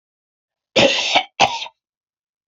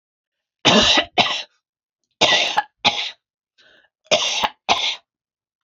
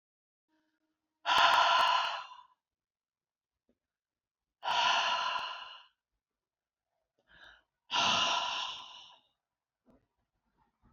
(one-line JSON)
{"cough_length": "2.5 s", "cough_amplitude": 30336, "cough_signal_mean_std_ratio": 0.39, "three_cough_length": "5.6 s", "three_cough_amplitude": 29026, "three_cough_signal_mean_std_ratio": 0.44, "exhalation_length": "10.9 s", "exhalation_amplitude": 7963, "exhalation_signal_mean_std_ratio": 0.4, "survey_phase": "beta (2021-08-13 to 2022-03-07)", "age": "45-64", "gender": "Female", "wearing_mask": "No", "symptom_none": true, "symptom_onset": "4 days", "smoker_status": "Ex-smoker", "respiratory_condition_asthma": false, "respiratory_condition_other": false, "recruitment_source": "REACT", "submission_delay": "6 days", "covid_test_result": "Negative", "covid_test_method": "RT-qPCR", "influenza_a_test_result": "Negative", "influenza_b_test_result": "Negative"}